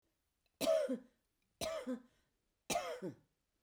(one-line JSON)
{"three_cough_length": "3.6 s", "three_cough_amplitude": 2036, "three_cough_signal_mean_std_ratio": 0.43, "survey_phase": "beta (2021-08-13 to 2022-03-07)", "age": "65+", "gender": "Female", "wearing_mask": "No", "symptom_none": true, "smoker_status": "Ex-smoker", "respiratory_condition_asthma": false, "respiratory_condition_other": false, "recruitment_source": "REACT", "submission_delay": "1 day", "covid_test_result": "Negative", "covid_test_method": "RT-qPCR"}